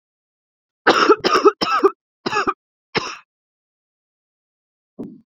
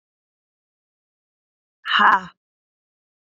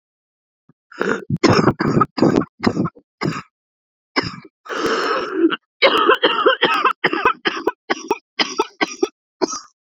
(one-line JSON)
{"three_cough_length": "5.4 s", "three_cough_amplitude": 27719, "three_cough_signal_mean_std_ratio": 0.35, "exhalation_length": "3.3 s", "exhalation_amplitude": 26260, "exhalation_signal_mean_std_ratio": 0.24, "cough_length": "9.8 s", "cough_amplitude": 32767, "cough_signal_mean_std_ratio": 0.53, "survey_phase": "beta (2021-08-13 to 2022-03-07)", "age": "18-44", "gender": "Female", "wearing_mask": "No", "symptom_cough_any": true, "symptom_new_continuous_cough": true, "symptom_runny_or_blocked_nose": true, "symptom_shortness_of_breath": true, "symptom_abdominal_pain": true, "symptom_diarrhoea": true, "symptom_fatigue": true, "symptom_fever_high_temperature": true, "symptom_headache": true, "smoker_status": "Current smoker (1 to 10 cigarettes per day)", "respiratory_condition_asthma": true, "respiratory_condition_other": false, "recruitment_source": "Test and Trace", "submission_delay": "1 day", "covid_test_result": "Positive", "covid_test_method": "RT-qPCR"}